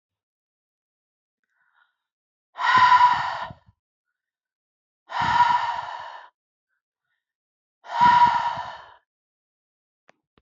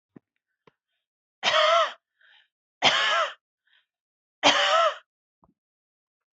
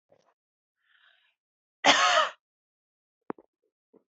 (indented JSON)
{
  "exhalation_length": "10.4 s",
  "exhalation_amplitude": 17017,
  "exhalation_signal_mean_std_ratio": 0.37,
  "three_cough_length": "6.4 s",
  "three_cough_amplitude": 21211,
  "three_cough_signal_mean_std_ratio": 0.39,
  "cough_length": "4.1 s",
  "cough_amplitude": 16804,
  "cough_signal_mean_std_ratio": 0.26,
  "survey_phase": "beta (2021-08-13 to 2022-03-07)",
  "age": "18-44",
  "gender": "Female",
  "wearing_mask": "No",
  "symptom_fatigue": true,
  "symptom_onset": "12 days",
  "smoker_status": "Never smoked",
  "respiratory_condition_asthma": false,
  "respiratory_condition_other": false,
  "recruitment_source": "REACT",
  "submission_delay": "4 days",
  "covid_test_result": "Negative",
  "covid_test_method": "RT-qPCR"
}